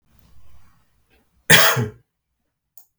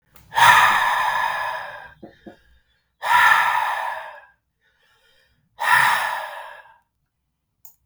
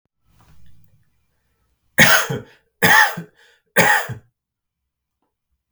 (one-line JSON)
{"cough_length": "3.0 s", "cough_amplitude": 32768, "cough_signal_mean_std_ratio": 0.28, "exhalation_length": "7.9 s", "exhalation_amplitude": 32768, "exhalation_signal_mean_std_ratio": 0.49, "three_cough_length": "5.7 s", "three_cough_amplitude": 32768, "three_cough_signal_mean_std_ratio": 0.33, "survey_phase": "beta (2021-08-13 to 2022-03-07)", "age": "45-64", "gender": "Male", "wearing_mask": "No", "symptom_none": true, "smoker_status": "Never smoked", "respiratory_condition_asthma": false, "respiratory_condition_other": false, "recruitment_source": "REACT", "submission_delay": "1 day", "covid_test_result": "Negative", "covid_test_method": "RT-qPCR"}